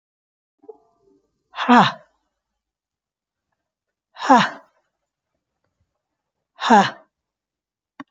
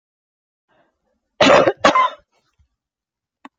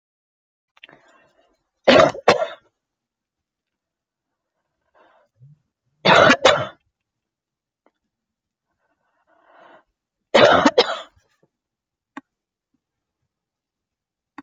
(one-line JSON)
{"exhalation_length": "8.1 s", "exhalation_amplitude": 28466, "exhalation_signal_mean_std_ratio": 0.24, "cough_length": "3.6 s", "cough_amplitude": 30611, "cough_signal_mean_std_ratio": 0.32, "three_cough_length": "14.4 s", "three_cough_amplitude": 30205, "three_cough_signal_mean_std_ratio": 0.25, "survey_phase": "beta (2021-08-13 to 2022-03-07)", "age": "65+", "gender": "Female", "wearing_mask": "No", "symptom_cough_any": true, "symptom_shortness_of_breath": true, "symptom_sore_throat": true, "symptom_onset": "5 days", "smoker_status": "Never smoked", "respiratory_condition_asthma": true, "respiratory_condition_other": false, "recruitment_source": "REACT", "submission_delay": "2 days", "covid_test_result": "Negative", "covid_test_method": "RT-qPCR", "influenza_a_test_result": "Negative", "influenza_b_test_result": "Negative"}